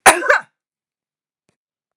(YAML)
cough_length: 2.0 s
cough_amplitude: 32768
cough_signal_mean_std_ratio: 0.27
survey_phase: beta (2021-08-13 to 2022-03-07)
age: 65+
gender: Female
wearing_mask: 'No'
symptom_none: true
smoker_status: Never smoked
respiratory_condition_asthma: false
respiratory_condition_other: false
recruitment_source: REACT
submission_delay: 1 day
covid_test_result: Negative
covid_test_method: RT-qPCR
influenza_a_test_result: Negative
influenza_b_test_result: Negative